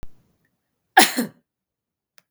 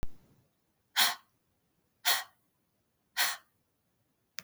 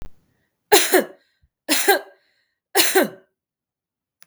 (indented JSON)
{
  "cough_length": "2.3 s",
  "cough_amplitude": 32768,
  "cough_signal_mean_std_ratio": 0.23,
  "exhalation_length": "4.4 s",
  "exhalation_amplitude": 9966,
  "exhalation_signal_mean_std_ratio": 0.3,
  "three_cough_length": "4.3 s",
  "three_cough_amplitude": 32768,
  "three_cough_signal_mean_std_ratio": 0.36,
  "survey_phase": "beta (2021-08-13 to 2022-03-07)",
  "age": "45-64",
  "gender": "Female",
  "wearing_mask": "No",
  "symptom_none": true,
  "smoker_status": "Never smoked",
  "respiratory_condition_asthma": false,
  "respiratory_condition_other": false,
  "recruitment_source": "REACT",
  "submission_delay": "1 day",
  "covid_test_result": "Negative",
  "covid_test_method": "RT-qPCR"
}